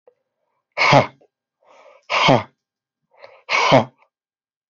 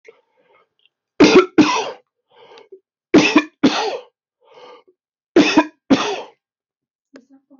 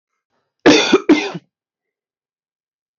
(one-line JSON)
{"exhalation_length": "4.7 s", "exhalation_amplitude": 27998, "exhalation_signal_mean_std_ratio": 0.34, "three_cough_length": "7.6 s", "three_cough_amplitude": 29439, "three_cough_signal_mean_std_ratio": 0.36, "cough_length": "3.0 s", "cough_amplitude": 31735, "cough_signal_mean_std_ratio": 0.32, "survey_phase": "beta (2021-08-13 to 2022-03-07)", "age": "45-64", "gender": "Male", "wearing_mask": "No", "symptom_none": true, "smoker_status": "Never smoked", "respiratory_condition_asthma": false, "respiratory_condition_other": false, "recruitment_source": "REACT", "submission_delay": "1 day", "covid_test_result": "Negative", "covid_test_method": "RT-qPCR"}